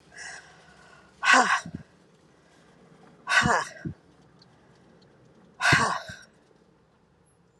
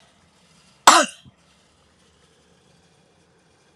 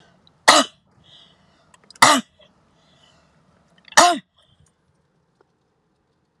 {"exhalation_length": "7.6 s", "exhalation_amplitude": 17480, "exhalation_signal_mean_std_ratio": 0.34, "cough_length": "3.8 s", "cough_amplitude": 32768, "cough_signal_mean_std_ratio": 0.18, "three_cough_length": "6.4 s", "three_cough_amplitude": 32768, "three_cough_signal_mean_std_ratio": 0.23, "survey_phase": "beta (2021-08-13 to 2022-03-07)", "age": "65+", "gender": "Female", "wearing_mask": "No", "symptom_none": true, "smoker_status": "Never smoked", "respiratory_condition_asthma": false, "respiratory_condition_other": false, "recruitment_source": "REACT", "submission_delay": "3 days", "covid_test_result": "Negative", "covid_test_method": "RT-qPCR"}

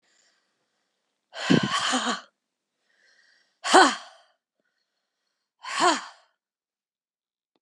{"exhalation_length": "7.6 s", "exhalation_amplitude": 25800, "exhalation_signal_mean_std_ratio": 0.29, "survey_phase": "beta (2021-08-13 to 2022-03-07)", "age": "65+", "gender": "Female", "wearing_mask": "No", "symptom_none": true, "smoker_status": "Never smoked", "respiratory_condition_asthma": false, "respiratory_condition_other": false, "recruitment_source": "REACT", "submission_delay": "2 days", "covid_test_result": "Negative", "covid_test_method": "RT-qPCR", "influenza_a_test_result": "Negative", "influenza_b_test_result": "Negative"}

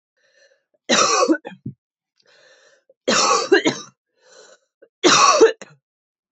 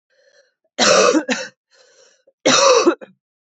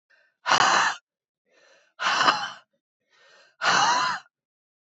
{"three_cough_length": "6.3 s", "three_cough_amplitude": 28307, "three_cough_signal_mean_std_ratio": 0.41, "cough_length": "3.4 s", "cough_amplitude": 28537, "cough_signal_mean_std_ratio": 0.47, "exhalation_length": "4.9 s", "exhalation_amplitude": 20739, "exhalation_signal_mean_std_ratio": 0.46, "survey_phase": "beta (2021-08-13 to 2022-03-07)", "age": "18-44", "gender": "Female", "wearing_mask": "No", "symptom_cough_any": true, "symptom_runny_or_blocked_nose": true, "symptom_sore_throat": true, "symptom_fatigue": true, "symptom_change_to_sense_of_smell_or_taste": true, "symptom_onset": "4 days", "smoker_status": "Never smoked", "respiratory_condition_asthma": false, "respiratory_condition_other": false, "recruitment_source": "Test and Trace", "submission_delay": "1 day", "covid_test_result": "Positive", "covid_test_method": "RT-qPCR", "covid_ct_value": 20.0, "covid_ct_gene": "ORF1ab gene", "covid_ct_mean": 20.8, "covid_viral_load": "150000 copies/ml", "covid_viral_load_category": "Low viral load (10K-1M copies/ml)"}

